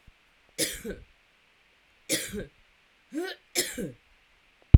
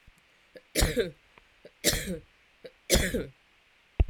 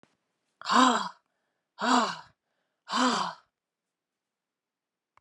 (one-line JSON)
{"three_cough_length": "4.8 s", "three_cough_amplitude": 32768, "three_cough_signal_mean_std_ratio": 0.21, "cough_length": "4.1 s", "cough_amplitude": 15798, "cough_signal_mean_std_ratio": 0.39, "exhalation_length": "5.2 s", "exhalation_amplitude": 12827, "exhalation_signal_mean_std_ratio": 0.36, "survey_phase": "alpha (2021-03-01 to 2021-08-12)", "age": "65+", "gender": "Female", "wearing_mask": "No", "symptom_cough_any": true, "symptom_fatigue": true, "symptom_onset": "3 days", "smoker_status": "Ex-smoker", "respiratory_condition_asthma": false, "respiratory_condition_other": false, "recruitment_source": "Test and Trace", "submission_delay": "0 days", "covid_test_result": "Positive", "covid_test_method": "RT-qPCR"}